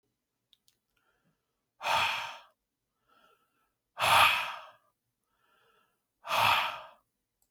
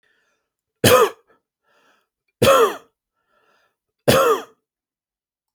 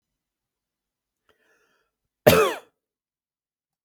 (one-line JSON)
{"exhalation_length": "7.5 s", "exhalation_amplitude": 9734, "exhalation_signal_mean_std_ratio": 0.34, "three_cough_length": "5.5 s", "three_cough_amplitude": 32768, "three_cough_signal_mean_std_ratio": 0.33, "cough_length": "3.8 s", "cough_amplitude": 32766, "cough_signal_mean_std_ratio": 0.19, "survey_phase": "beta (2021-08-13 to 2022-03-07)", "age": "18-44", "gender": "Male", "wearing_mask": "No", "symptom_none": true, "smoker_status": "Ex-smoker", "respiratory_condition_asthma": false, "respiratory_condition_other": false, "recruitment_source": "REACT", "submission_delay": "1 day", "covid_test_result": "Negative", "covid_test_method": "RT-qPCR"}